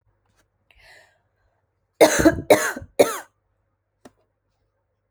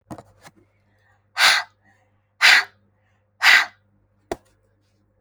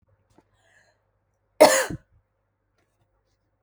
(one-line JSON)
{"three_cough_length": "5.1 s", "three_cough_amplitude": 28352, "three_cough_signal_mean_std_ratio": 0.26, "exhalation_length": "5.2 s", "exhalation_amplitude": 32039, "exhalation_signal_mean_std_ratio": 0.29, "cough_length": "3.6 s", "cough_amplitude": 28249, "cough_signal_mean_std_ratio": 0.19, "survey_phase": "alpha (2021-03-01 to 2021-08-12)", "age": "18-44", "gender": "Female", "wearing_mask": "No", "symptom_none": true, "smoker_status": "Never smoked", "respiratory_condition_asthma": false, "respiratory_condition_other": false, "recruitment_source": "REACT", "submission_delay": "8 days", "covid_test_result": "Negative", "covid_test_method": "RT-qPCR"}